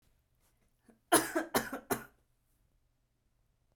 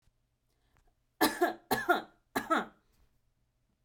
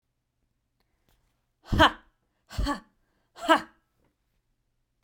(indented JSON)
{
  "cough_length": "3.8 s",
  "cough_amplitude": 9412,
  "cough_signal_mean_std_ratio": 0.27,
  "three_cough_length": "3.8 s",
  "three_cough_amplitude": 10849,
  "three_cough_signal_mean_std_ratio": 0.34,
  "exhalation_length": "5.0 s",
  "exhalation_amplitude": 15578,
  "exhalation_signal_mean_std_ratio": 0.24,
  "survey_phase": "beta (2021-08-13 to 2022-03-07)",
  "age": "18-44",
  "gender": "Female",
  "wearing_mask": "No",
  "symptom_fatigue": true,
  "symptom_other": true,
  "smoker_status": "Never smoked",
  "respiratory_condition_asthma": false,
  "respiratory_condition_other": false,
  "recruitment_source": "REACT",
  "submission_delay": "1 day",
  "covid_test_result": "Negative",
  "covid_test_method": "RT-qPCR"
}